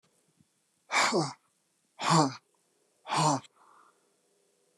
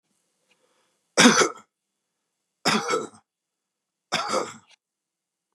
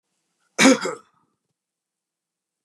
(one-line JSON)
{"exhalation_length": "4.8 s", "exhalation_amplitude": 9913, "exhalation_signal_mean_std_ratio": 0.37, "three_cough_length": "5.5 s", "three_cough_amplitude": 28478, "three_cough_signal_mean_std_ratio": 0.3, "cough_length": "2.6 s", "cough_amplitude": 25053, "cough_signal_mean_std_ratio": 0.24, "survey_phase": "beta (2021-08-13 to 2022-03-07)", "age": "18-44", "gender": "Male", "wearing_mask": "No", "symptom_runny_or_blocked_nose": true, "symptom_sore_throat": true, "symptom_fatigue": true, "symptom_headache": true, "symptom_onset": "13 days", "smoker_status": "Never smoked", "respiratory_condition_asthma": false, "respiratory_condition_other": false, "recruitment_source": "REACT", "submission_delay": "3 days", "covid_test_result": "Negative", "covid_test_method": "RT-qPCR", "influenza_a_test_result": "Negative", "influenza_b_test_result": "Negative"}